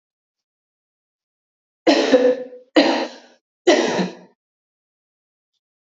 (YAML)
three_cough_length: 5.9 s
three_cough_amplitude: 27309
three_cough_signal_mean_std_ratio: 0.36
survey_phase: beta (2021-08-13 to 2022-03-07)
age: 18-44
gender: Female
wearing_mask: 'No'
symptom_cough_any: true
symptom_runny_or_blocked_nose: true
symptom_shortness_of_breath: true
symptom_fatigue: true
smoker_status: Never smoked
respiratory_condition_asthma: false
respiratory_condition_other: false
recruitment_source: Test and Trace
submission_delay: 1 day
covid_test_result: Positive
covid_test_method: LFT